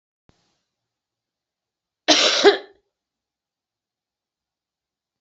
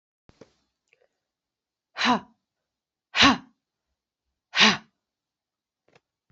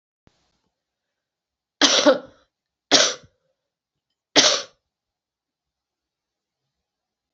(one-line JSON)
{"cough_length": "5.2 s", "cough_amplitude": 32767, "cough_signal_mean_std_ratio": 0.23, "exhalation_length": "6.3 s", "exhalation_amplitude": 23370, "exhalation_signal_mean_std_ratio": 0.23, "three_cough_length": "7.3 s", "three_cough_amplitude": 29805, "three_cough_signal_mean_std_ratio": 0.25, "survey_phase": "beta (2021-08-13 to 2022-03-07)", "age": "18-44", "gender": "Female", "wearing_mask": "No", "symptom_runny_or_blocked_nose": true, "symptom_fatigue": true, "symptom_headache": true, "symptom_loss_of_taste": true, "symptom_onset": "3 days", "smoker_status": "Never smoked", "respiratory_condition_asthma": false, "respiratory_condition_other": false, "recruitment_source": "Test and Trace", "submission_delay": "2 days", "covid_test_result": "Positive", "covid_test_method": "RT-qPCR"}